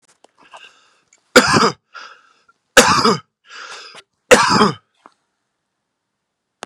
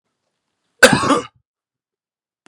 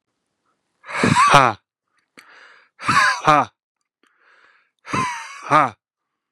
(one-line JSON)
{"three_cough_length": "6.7 s", "three_cough_amplitude": 32768, "three_cough_signal_mean_std_ratio": 0.33, "cough_length": "2.5 s", "cough_amplitude": 32768, "cough_signal_mean_std_ratio": 0.27, "exhalation_length": "6.3 s", "exhalation_amplitude": 32768, "exhalation_signal_mean_std_ratio": 0.37, "survey_phase": "beta (2021-08-13 to 2022-03-07)", "age": "18-44", "gender": "Male", "wearing_mask": "No", "symptom_fatigue": true, "symptom_onset": "12 days", "smoker_status": "Current smoker (e-cigarettes or vapes only)", "respiratory_condition_asthma": false, "respiratory_condition_other": false, "recruitment_source": "REACT", "submission_delay": "3 days", "covid_test_result": "Negative", "covid_test_method": "RT-qPCR", "influenza_a_test_result": "Negative", "influenza_b_test_result": "Negative"}